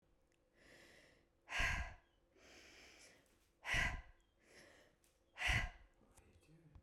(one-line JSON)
{"exhalation_length": "6.8 s", "exhalation_amplitude": 1756, "exhalation_signal_mean_std_ratio": 0.37, "survey_phase": "beta (2021-08-13 to 2022-03-07)", "age": "45-64", "gender": "Female", "wearing_mask": "No", "symptom_none": true, "smoker_status": "Ex-smoker", "respiratory_condition_asthma": false, "respiratory_condition_other": false, "recruitment_source": "REACT", "submission_delay": "3 days", "covid_test_result": "Negative", "covid_test_method": "RT-qPCR", "influenza_a_test_result": "Unknown/Void", "influenza_b_test_result": "Unknown/Void"}